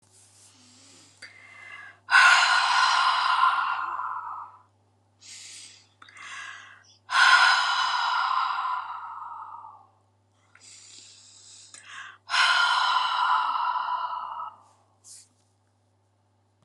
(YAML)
exhalation_length: 16.6 s
exhalation_amplitude: 19947
exhalation_signal_mean_std_ratio: 0.52
survey_phase: alpha (2021-03-01 to 2021-08-12)
age: 45-64
gender: Female
wearing_mask: 'No'
symptom_cough_any: true
symptom_shortness_of_breath: true
symptom_abdominal_pain: true
symptom_diarrhoea: true
symptom_fatigue: true
smoker_status: Ex-smoker
respiratory_condition_asthma: true
respiratory_condition_other: true
recruitment_source: REACT
submission_delay: 1 day
covid_test_result: Negative
covid_test_method: RT-qPCR